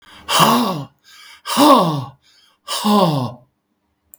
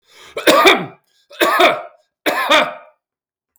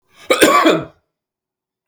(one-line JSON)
{"exhalation_length": "4.2 s", "exhalation_amplitude": 32768, "exhalation_signal_mean_std_ratio": 0.52, "three_cough_length": "3.6 s", "three_cough_amplitude": 32768, "three_cough_signal_mean_std_ratio": 0.48, "cough_length": "1.9 s", "cough_amplitude": 32768, "cough_signal_mean_std_ratio": 0.43, "survey_phase": "beta (2021-08-13 to 2022-03-07)", "age": "65+", "gender": "Male", "wearing_mask": "No", "symptom_none": true, "symptom_onset": "12 days", "smoker_status": "Ex-smoker", "respiratory_condition_asthma": false, "respiratory_condition_other": false, "recruitment_source": "REACT", "submission_delay": "2 days", "covid_test_result": "Negative", "covid_test_method": "RT-qPCR", "influenza_a_test_result": "Negative", "influenza_b_test_result": "Negative"}